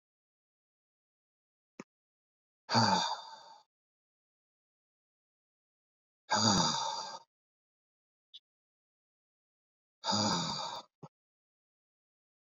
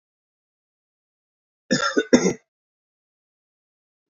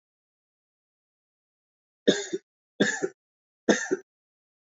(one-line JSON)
{"exhalation_length": "12.5 s", "exhalation_amplitude": 8106, "exhalation_signal_mean_std_ratio": 0.31, "cough_length": "4.1 s", "cough_amplitude": 27627, "cough_signal_mean_std_ratio": 0.24, "three_cough_length": "4.8 s", "three_cough_amplitude": 17533, "three_cough_signal_mean_std_ratio": 0.26, "survey_phase": "alpha (2021-03-01 to 2021-08-12)", "age": "18-44", "gender": "Male", "wearing_mask": "No", "symptom_cough_any": true, "symptom_abdominal_pain": true, "symptom_fatigue": true, "symptom_fever_high_temperature": true, "symptom_headache": true, "symptom_change_to_sense_of_smell_or_taste": true, "symptom_loss_of_taste": true, "smoker_status": "Never smoked", "respiratory_condition_asthma": false, "respiratory_condition_other": false, "recruitment_source": "Test and Trace", "submission_delay": "2 days", "covid_test_result": "Positive", "covid_test_method": "RT-qPCR", "covid_ct_value": 18.0, "covid_ct_gene": "ORF1ab gene", "covid_ct_mean": 18.4, "covid_viral_load": "940000 copies/ml", "covid_viral_load_category": "Low viral load (10K-1M copies/ml)"}